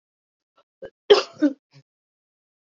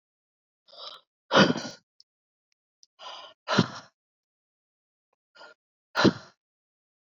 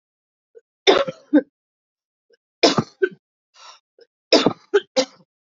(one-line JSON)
{"cough_length": "2.7 s", "cough_amplitude": 30528, "cough_signal_mean_std_ratio": 0.21, "exhalation_length": "7.1 s", "exhalation_amplitude": 18306, "exhalation_signal_mean_std_ratio": 0.23, "three_cough_length": "5.5 s", "three_cough_amplitude": 29640, "three_cough_signal_mean_std_ratio": 0.29, "survey_phase": "beta (2021-08-13 to 2022-03-07)", "age": "18-44", "gender": "Female", "wearing_mask": "No", "symptom_cough_any": true, "symptom_runny_or_blocked_nose": true, "symptom_diarrhoea": true, "symptom_onset": "6 days", "smoker_status": "Current smoker (1 to 10 cigarettes per day)", "respiratory_condition_asthma": true, "respiratory_condition_other": false, "recruitment_source": "Test and Trace", "submission_delay": "3 days", "covid_test_result": "Positive", "covid_test_method": "RT-qPCR", "covid_ct_value": 30.4, "covid_ct_gene": "ORF1ab gene", "covid_ct_mean": 30.5, "covid_viral_load": "100 copies/ml", "covid_viral_load_category": "Minimal viral load (< 10K copies/ml)"}